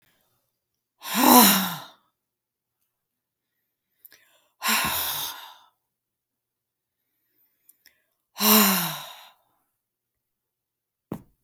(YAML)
exhalation_length: 11.4 s
exhalation_amplitude: 31662
exhalation_signal_mean_std_ratio: 0.29
survey_phase: beta (2021-08-13 to 2022-03-07)
age: 65+
gender: Female
wearing_mask: 'No'
symptom_none: true
smoker_status: Never smoked
respiratory_condition_asthma: false
respiratory_condition_other: false
recruitment_source: REACT
submission_delay: 1 day
covid_test_result: Negative
covid_test_method: RT-qPCR